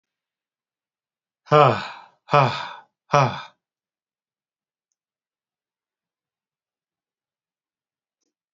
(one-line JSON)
{"exhalation_length": "8.5 s", "exhalation_amplitude": 27878, "exhalation_signal_mean_std_ratio": 0.22, "survey_phase": "alpha (2021-03-01 to 2021-08-12)", "age": "18-44", "gender": "Male", "wearing_mask": "No", "symptom_none": true, "smoker_status": "Never smoked", "respiratory_condition_asthma": false, "respiratory_condition_other": false, "recruitment_source": "REACT", "submission_delay": "1 day", "covid_test_result": "Negative", "covid_test_method": "RT-qPCR"}